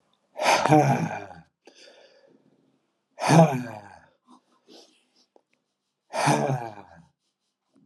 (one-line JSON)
{"exhalation_length": "7.9 s", "exhalation_amplitude": 23401, "exhalation_signal_mean_std_ratio": 0.35, "survey_phase": "alpha (2021-03-01 to 2021-08-12)", "age": "45-64", "gender": "Male", "wearing_mask": "No", "symptom_cough_any": true, "symptom_change_to_sense_of_smell_or_taste": true, "symptom_loss_of_taste": true, "symptom_onset": "3 days", "smoker_status": "Never smoked", "respiratory_condition_asthma": false, "respiratory_condition_other": false, "recruitment_source": "Test and Trace", "submission_delay": "2 days", "covid_test_result": "Positive", "covid_test_method": "RT-qPCR", "covid_ct_value": 13.0, "covid_ct_gene": "N gene", "covid_ct_mean": 13.9, "covid_viral_load": "28000000 copies/ml", "covid_viral_load_category": "High viral load (>1M copies/ml)"}